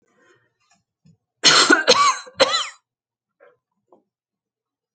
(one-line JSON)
{"cough_length": "4.9 s", "cough_amplitude": 32768, "cough_signal_mean_std_ratio": 0.33, "survey_phase": "alpha (2021-03-01 to 2021-08-12)", "age": "65+", "gender": "Female", "wearing_mask": "No", "symptom_none": true, "smoker_status": "Ex-smoker", "respiratory_condition_asthma": false, "respiratory_condition_other": false, "recruitment_source": "REACT", "submission_delay": "1 day", "covid_test_result": "Negative", "covid_test_method": "RT-qPCR"}